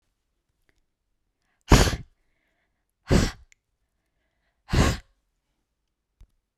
{"exhalation_length": "6.6 s", "exhalation_amplitude": 30527, "exhalation_signal_mean_std_ratio": 0.24, "survey_phase": "beta (2021-08-13 to 2022-03-07)", "age": "45-64", "gender": "Female", "wearing_mask": "No", "symptom_none": true, "smoker_status": "Ex-smoker", "respiratory_condition_asthma": false, "respiratory_condition_other": false, "recruitment_source": "REACT", "submission_delay": "0 days", "covid_test_result": "Negative", "covid_test_method": "RT-qPCR"}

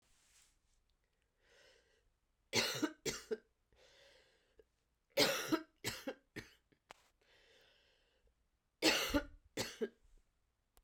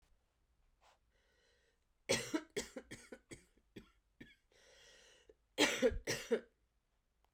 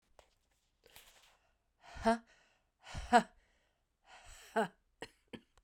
{"three_cough_length": "10.8 s", "three_cough_amplitude": 4897, "three_cough_signal_mean_std_ratio": 0.31, "cough_length": "7.3 s", "cough_amplitude": 4181, "cough_signal_mean_std_ratio": 0.3, "exhalation_length": "5.6 s", "exhalation_amplitude": 6291, "exhalation_signal_mean_std_ratio": 0.23, "survey_phase": "beta (2021-08-13 to 2022-03-07)", "age": "45-64", "gender": "Female", "wearing_mask": "No", "symptom_cough_any": true, "symptom_new_continuous_cough": true, "symptom_runny_or_blocked_nose": true, "symptom_shortness_of_breath": true, "symptom_sore_throat": true, "symptom_fatigue": true, "symptom_fever_high_temperature": true, "symptom_headache": true, "symptom_change_to_sense_of_smell_or_taste": true, "symptom_loss_of_taste": true, "symptom_onset": "4 days", "smoker_status": "Never smoked", "respiratory_condition_asthma": false, "respiratory_condition_other": false, "recruitment_source": "Test and Trace", "submission_delay": "2 days", "covid_test_result": "Positive", "covid_test_method": "RT-qPCR", "covid_ct_value": 19.0, "covid_ct_gene": "ORF1ab gene"}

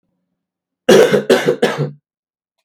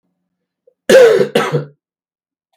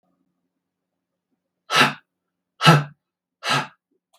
{"three_cough_length": "2.6 s", "three_cough_amplitude": 32768, "three_cough_signal_mean_std_ratio": 0.43, "cough_length": "2.6 s", "cough_amplitude": 32768, "cough_signal_mean_std_ratio": 0.4, "exhalation_length": "4.2 s", "exhalation_amplitude": 32768, "exhalation_signal_mean_std_ratio": 0.28, "survey_phase": "beta (2021-08-13 to 2022-03-07)", "age": "45-64", "gender": "Male", "wearing_mask": "No", "symptom_cough_any": true, "symptom_runny_or_blocked_nose": true, "symptom_fatigue": true, "symptom_onset": "4 days", "smoker_status": "Never smoked", "respiratory_condition_asthma": false, "respiratory_condition_other": false, "recruitment_source": "Test and Trace", "submission_delay": "2 days", "covid_test_result": "Positive", "covid_test_method": "ePCR"}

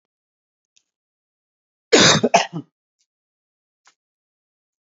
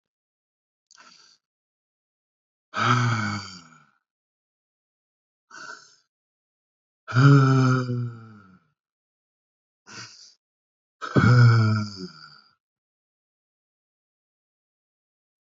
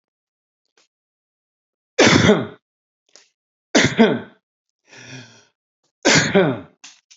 {"cough_length": "4.9 s", "cough_amplitude": 30814, "cough_signal_mean_std_ratio": 0.24, "exhalation_length": "15.4 s", "exhalation_amplitude": 19366, "exhalation_signal_mean_std_ratio": 0.32, "three_cough_length": "7.2 s", "three_cough_amplitude": 32767, "three_cough_signal_mean_std_ratio": 0.34, "survey_phase": "beta (2021-08-13 to 2022-03-07)", "age": "45-64", "gender": "Male", "wearing_mask": "No", "symptom_none": true, "smoker_status": "Current smoker (e-cigarettes or vapes only)", "respiratory_condition_asthma": false, "respiratory_condition_other": false, "recruitment_source": "REACT", "submission_delay": "4 days", "covid_test_result": "Negative", "covid_test_method": "RT-qPCR", "influenza_a_test_result": "Negative", "influenza_b_test_result": "Negative"}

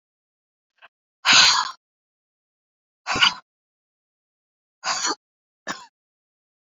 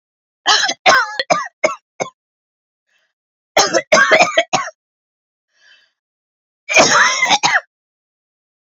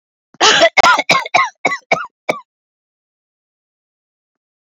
{"exhalation_length": "6.7 s", "exhalation_amplitude": 27803, "exhalation_signal_mean_std_ratio": 0.27, "three_cough_length": "8.6 s", "three_cough_amplitude": 32088, "three_cough_signal_mean_std_ratio": 0.43, "cough_length": "4.7 s", "cough_amplitude": 30084, "cough_signal_mean_std_ratio": 0.38, "survey_phase": "beta (2021-08-13 to 2022-03-07)", "age": "45-64", "gender": "Female", "wearing_mask": "No", "symptom_cough_any": true, "symptom_runny_or_blocked_nose": true, "symptom_sore_throat": true, "symptom_abdominal_pain": true, "symptom_diarrhoea": true, "symptom_fatigue": true, "symptom_headache": true, "symptom_onset": "7 days", "smoker_status": "Never smoked", "respiratory_condition_asthma": false, "respiratory_condition_other": false, "recruitment_source": "Test and Trace", "submission_delay": "2 days", "covid_test_result": "Positive", "covid_test_method": "RT-qPCR", "covid_ct_value": 18.3, "covid_ct_gene": "ORF1ab gene", "covid_ct_mean": 18.9, "covid_viral_load": "640000 copies/ml", "covid_viral_load_category": "Low viral load (10K-1M copies/ml)"}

